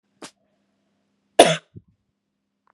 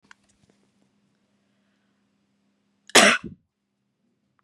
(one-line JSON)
{"cough_length": "2.7 s", "cough_amplitude": 32768, "cough_signal_mean_std_ratio": 0.17, "three_cough_length": "4.4 s", "three_cough_amplitude": 32386, "three_cough_signal_mean_std_ratio": 0.18, "survey_phase": "beta (2021-08-13 to 2022-03-07)", "age": "18-44", "gender": "Female", "wearing_mask": "No", "symptom_runny_or_blocked_nose": true, "symptom_onset": "4 days", "smoker_status": "Never smoked", "respiratory_condition_asthma": false, "respiratory_condition_other": false, "recruitment_source": "REACT", "submission_delay": "1 day", "covid_test_result": "Negative", "covid_test_method": "RT-qPCR", "influenza_a_test_result": "Negative", "influenza_b_test_result": "Negative"}